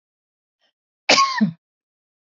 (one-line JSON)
{"cough_length": "2.3 s", "cough_amplitude": 29403, "cough_signal_mean_std_ratio": 0.32, "survey_phase": "beta (2021-08-13 to 2022-03-07)", "age": "65+", "gender": "Female", "wearing_mask": "No", "symptom_none": true, "smoker_status": "Ex-smoker", "respiratory_condition_asthma": false, "respiratory_condition_other": false, "recruitment_source": "REACT", "submission_delay": "1 day", "covid_test_result": "Negative", "covid_test_method": "RT-qPCR", "influenza_a_test_result": "Negative", "influenza_b_test_result": "Negative"}